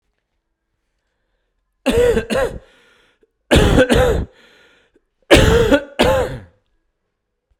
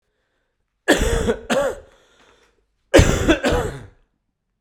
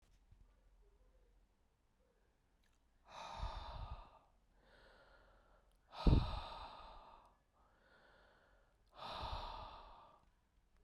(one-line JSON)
{"three_cough_length": "7.6 s", "three_cough_amplitude": 32768, "three_cough_signal_mean_std_ratio": 0.44, "cough_length": "4.6 s", "cough_amplitude": 32768, "cough_signal_mean_std_ratio": 0.43, "exhalation_length": "10.8 s", "exhalation_amplitude": 4137, "exhalation_signal_mean_std_ratio": 0.29, "survey_phase": "beta (2021-08-13 to 2022-03-07)", "age": "45-64", "gender": "Male", "wearing_mask": "No", "symptom_cough_any": true, "symptom_new_continuous_cough": true, "symptom_shortness_of_breath": true, "symptom_onset": "8 days", "smoker_status": "Never smoked", "respiratory_condition_asthma": false, "respiratory_condition_other": false, "recruitment_source": "Test and Trace", "submission_delay": "2 days", "covid_test_result": "Positive", "covid_test_method": "ePCR"}